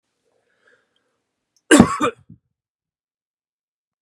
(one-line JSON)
{"cough_length": "4.0 s", "cough_amplitude": 32768, "cough_signal_mean_std_ratio": 0.2, "survey_phase": "beta (2021-08-13 to 2022-03-07)", "age": "18-44", "gender": "Male", "wearing_mask": "No", "symptom_cough_any": true, "symptom_fatigue": true, "symptom_onset": "10 days", "smoker_status": "Never smoked", "respiratory_condition_asthma": false, "respiratory_condition_other": false, "recruitment_source": "REACT", "submission_delay": "2 days", "covid_test_result": "Negative", "covid_test_method": "RT-qPCR", "influenza_a_test_result": "Negative", "influenza_b_test_result": "Negative"}